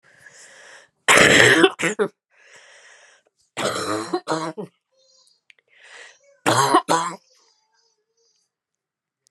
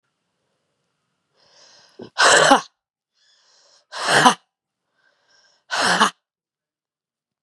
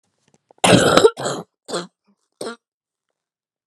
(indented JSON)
{
  "three_cough_length": "9.3 s",
  "three_cough_amplitude": 32767,
  "three_cough_signal_mean_std_ratio": 0.36,
  "exhalation_length": "7.4 s",
  "exhalation_amplitude": 32767,
  "exhalation_signal_mean_std_ratio": 0.3,
  "cough_length": "3.7 s",
  "cough_amplitude": 32768,
  "cough_signal_mean_std_ratio": 0.33,
  "survey_phase": "beta (2021-08-13 to 2022-03-07)",
  "age": "18-44",
  "gender": "Female",
  "wearing_mask": "No",
  "symptom_cough_any": true,
  "symptom_runny_or_blocked_nose": true,
  "symptom_shortness_of_breath": true,
  "symptom_fatigue": true,
  "symptom_fever_high_temperature": true,
  "symptom_onset": "2 days",
  "smoker_status": "Never smoked",
  "respiratory_condition_asthma": false,
  "respiratory_condition_other": false,
  "recruitment_source": "Test and Trace",
  "submission_delay": "1 day",
  "covid_test_result": "Positive",
  "covid_test_method": "RT-qPCR",
  "covid_ct_value": 25.5,
  "covid_ct_gene": "ORF1ab gene"
}